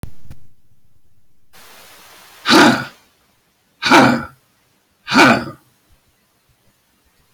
{"exhalation_length": "7.3 s", "exhalation_amplitude": 31198, "exhalation_signal_mean_std_ratio": 0.36, "survey_phase": "beta (2021-08-13 to 2022-03-07)", "age": "65+", "gender": "Male", "wearing_mask": "No", "symptom_none": true, "smoker_status": "Ex-smoker", "respiratory_condition_asthma": false, "respiratory_condition_other": false, "recruitment_source": "REACT", "submission_delay": "2 days", "covid_test_result": "Negative", "covid_test_method": "RT-qPCR"}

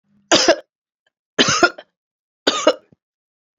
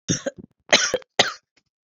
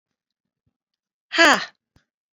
{"three_cough_length": "3.6 s", "three_cough_amplitude": 30560, "three_cough_signal_mean_std_ratio": 0.35, "cough_length": "2.0 s", "cough_amplitude": 32767, "cough_signal_mean_std_ratio": 0.35, "exhalation_length": "2.4 s", "exhalation_amplitude": 28064, "exhalation_signal_mean_std_ratio": 0.23, "survey_phase": "beta (2021-08-13 to 2022-03-07)", "age": "45-64", "gender": "Female", "wearing_mask": "No", "symptom_cough_any": true, "symptom_runny_or_blocked_nose": true, "symptom_sore_throat": true, "symptom_change_to_sense_of_smell_or_taste": true, "symptom_loss_of_taste": true, "symptom_other": true, "symptom_onset": "5 days", "smoker_status": "Never smoked", "respiratory_condition_asthma": false, "respiratory_condition_other": false, "recruitment_source": "Test and Trace", "submission_delay": "2 days", "covid_test_result": "Positive", "covid_test_method": "RT-qPCR"}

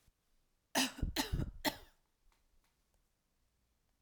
{"cough_length": "4.0 s", "cough_amplitude": 3159, "cough_signal_mean_std_ratio": 0.33, "survey_phase": "alpha (2021-03-01 to 2021-08-12)", "age": "45-64", "gender": "Female", "wearing_mask": "No", "symptom_none": true, "smoker_status": "Ex-smoker", "respiratory_condition_asthma": false, "respiratory_condition_other": false, "recruitment_source": "REACT", "submission_delay": "2 days", "covid_test_result": "Negative", "covid_test_method": "RT-qPCR"}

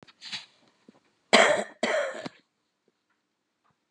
{"cough_length": "3.9 s", "cough_amplitude": 24272, "cough_signal_mean_std_ratio": 0.31, "survey_phase": "beta (2021-08-13 to 2022-03-07)", "age": "45-64", "gender": "Female", "wearing_mask": "No", "symptom_none": true, "smoker_status": "Ex-smoker", "respiratory_condition_asthma": false, "respiratory_condition_other": false, "recruitment_source": "REACT", "submission_delay": "1 day", "covid_test_result": "Negative", "covid_test_method": "RT-qPCR", "influenza_a_test_result": "Negative", "influenza_b_test_result": "Negative"}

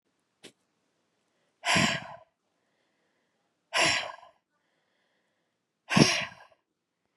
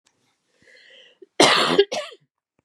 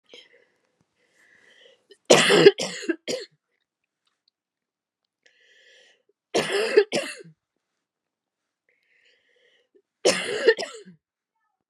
{"exhalation_length": "7.2 s", "exhalation_amplitude": 21335, "exhalation_signal_mean_std_ratio": 0.29, "cough_length": "2.6 s", "cough_amplitude": 29216, "cough_signal_mean_std_ratio": 0.35, "three_cough_length": "11.7 s", "three_cough_amplitude": 31463, "three_cough_signal_mean_std_ratio": 0.27, "survey_phase": "beta (2021-08-13 to 2022-03-07)", "age": "45-64", "gender": "Female", "wearing_mask": "No", "symptom_cough_any": true, "symptom_runny_or_blocked_nose": true, "symptom_sore_throat": true, "symptom_abdominal_pain": true, "symptom_diarrhoea": true, "symptom_fatigue": true, "symptom_headache": true, "symptom_change_to_sense_of_smell_or_taste": true, "smoker_status": "Ex-smoker", "respiratory_condition_asthma": true, "respiratory_condition_other": false, "recruitment_source": "Test and Trace", "submission_delay": "2 days", "covid_test_result": "Positive", "covid_test_method": "RT-qPCR"}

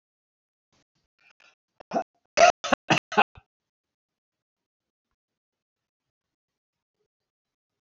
{"cough_length": "7.9 s", "cough_amplitude": 21367, "cough_signal_mean_std_ratio": 0.17, "survey_phase": "alpha (2021-03-01 to 2021-08-12)", "age": "65+", "gender": "Male", "wearing_mask": "No", "symptom_none": true, "smoker_status": "Ex-smoker", "respiratory_condition_asthma": false, "respiratory_condition_other": false, "recruitment_source": "REACT", "submission_delay": "1 day", "covid_test_result": "Negative", "covid_test_method": "RT-qPCR"}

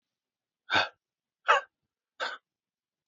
{"exhalation_length": "3.1 s", "exhalation_amplitude": 11834, "exhalation_signal_mean_std_ratio": 0.26, "survey_phase": "beta (2021-08-13 to 2022-03-07)", "age": "18-44", "gender": "Male", "wearing_mask": "No", "symptom_none": true, "symptom_onset": "10 days", "smoker_status": "Never smoked", "respiratory_condition_asthma": true, "respiratory_condition_other": false, "recruitment_source": "REACT", "submission_delay": "2 days", "covid_test_result": "Negative", "covid_test_method": "RT-qPCR", "influenza_a_test_result": "Negative", "influenza_b_test_result": "Negative"}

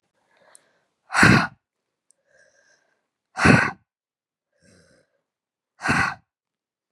{"exhalation_length": "6.9 s", "exhalation_amplitude": 31358, "exhalation_signal_mean_std_ratio": 0.27, "survey_phase": "beta (2021-08-13 to 2022-03-07)", "age": "18-44", "gender": "Female", "wearing_mask": "No", "symptom_runny_or_blocked_nose": true, "symptom_sore_throat": true, "symptom_diarrhoea": true, "symptom_fatigue": true, "symptom_fever_high_temperature": true, "symptom_headache": true, "symptom_other": true, "symptom_onset": "3 days", "smoker_status": "Ex-smoker", "respiratory_condition_asthma": false, "respiratory_condition_other": false, "recruitment_source": "Test and Trace", "submission_delay": "2 days", "covid_test_result": "Positive", "covid_test_method": "RT-qPCR", "covid_ct_value": 22.5, "covid_ct_gene": "ORF1ab gene"}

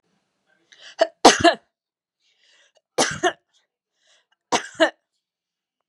{"three_cough_length": "5.9 s", "three_cough_amplitude": 32768, "three_cough_signal_mean_std_ratio": 0.24, "survey_phase": "beta (2021-08-13 to 2022-03-07)", "age": "45-64", "gender": "Female", "wearing_mask": "No", "symptom_runny_or_blocked_nose": true, "symptom_diarrhoea": true, "symptom_onset": "8 days", "smoker_status": "Never smoked", "respiratory_condition_asthma": false, "respiratory_condition_other": false, "recruitment_source": "Test and Trace", "submission_delay": "1 day", "covid_test_result": "Positive", "covid_test_method": "RT-qPCR", "covid_ct_value": 27.9, "covid_ct_gene": "ORF1ab gene"}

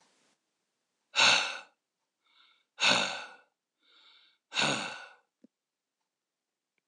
{"exhalation_length": "6.9 s", "exhalation_amplitude": 10316, "exhalation_signal_mean_std_ratio": 0.31, "survey_phase": "alpha (2021-03-01 to 2021-08-12)", "age": "45-64", "gender": "Male", "wearing_mask": "No", "symptom_none": true, "smoker_status": "Ex-smoker", "respiratory_condition_asthma": false, "respiratory_condition_other": false, "recruitment_source": "REACT", "submission_delay": "2 days", "covid_test_result": "Negative", "covid_test_method": "RT-qPCR"}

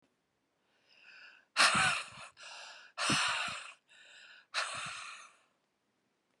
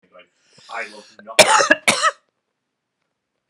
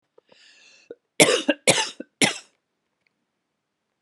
{"exhalation_length": "6.4 s", "exhalation_amplitude": 7117, "exhalation_signal_mean_std_ratio": 0.41, "cough_length": "3.5 s", "cough_amplitude": 32768, "cough_signal_mean_std_ratio": 0.32, "three_cough_length": "4.0 s", "three_cough_amplitude": 32107, "three_cough_signal_mean_std_ratio": 0.28, "survey_phase": "beta (2021-08-13 to 2022-03-07)", "age": "18-44", "gender": "Female", "wearing_mask": "No", "symptom_none": true, "symptom_onset": "12 days", "smoker_status": "Ex-smoker", "respiratory_condition_asthma": true, "respiratory_condition_other": false, "recruitment_source": "REACT", "submission_delay": "1 day", "covid_test_result": "Negative", "covid_test_method": "RT-qPCR"}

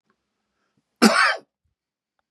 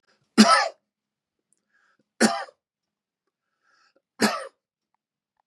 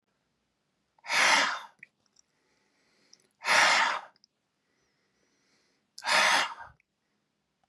{"cough_length": "2.3 s", "cough_amplitude": 32695, "cough_signal_mean_std_ratio": 0.29, "three_cough_length": "5.5 s", "three_cough_amplitude": 30778, "three_cough_signal_mean_std_ratio": 0.25, "exhalation_length": "7.7 s", "exhalation_amplitude": 12468, "exhalation_signal_mean_std_ratio": 0.36, "survey_phase": "beta (2021-08-13 to 2022-03-07)", "age": "65+", "gender": "Male", "wearing_mask": "No", "symptom_cough_any": true, "symptom_runny_or_blocked_nose": true, "symptom_sore_throat": true, "symptom_fever_high_temperature": true, "symptom_headache": true, "symptom_change_to_sense_of_smell_or_taste": true, "smoker_status": "Never smoked", "respiratory_condition_asthma": false, "respiratory_condition_other": false, "recruitment_source": "Test and Trace", "submission_delay": "1 day", "covid_test_result": "Positive", "covid_test_method": "RT-qPCR", "covid_ct_value": 18.0, "covid_ct_gene": "ORF1ab gene", "covid_ct_mean": 18.2, "covid_viral_load": "1000000 copies/ml", "covid_viral_load_category": "High viral load (>1M copies/ml)"}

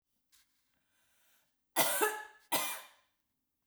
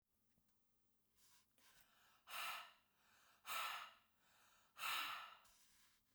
{"cough_length": "3.7 s", "cough_amplitude": 7147, "cough_signal_mean_std_ratio": 0.34, "exhalation_length": "6.1 s", "exhalation_amplitude": 753, "exhalation_signal_mean_std_ratio": 0.43, "survey_phase": "beta (2021-08-13 to 2022-03-07)", "age": "45-64", "gender": "Female", "wearing_mask": "No", "symptom_runny_or_blocked_nose": true, "symptom_onset": "13 days", "smoker_status": "Ex-smoker", "respiratory_condition_asthma": false, "respiratory_condition_other": false, "recruitment_source": "REACT", "submission_delay": "1 day", "covid_test_result": "Negative", "covid_test_method": "RT-qPCR"}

